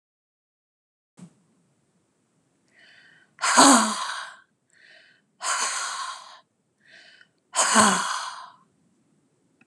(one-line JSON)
{"exhalation_length": "9.7 s", "exhalation_amplitude": 29182, "exhalation_signal_mean_std_ratio": 0.33, "survey_phase": "alpha (2021-03-01 to 2021-08-12)", "age": "65+", "gender": "Female", "wearing_mask": "No", "symptom_none": true, "smoker_status": "Ex-smoker", "respiratory_condition_asthma": false, "respiratory_condition_other": false, "recruitment_source": "REACT", "submission_delay": "2 days", "covid_test_result": "Negative", "covid_test_method": "RT-qPCR"}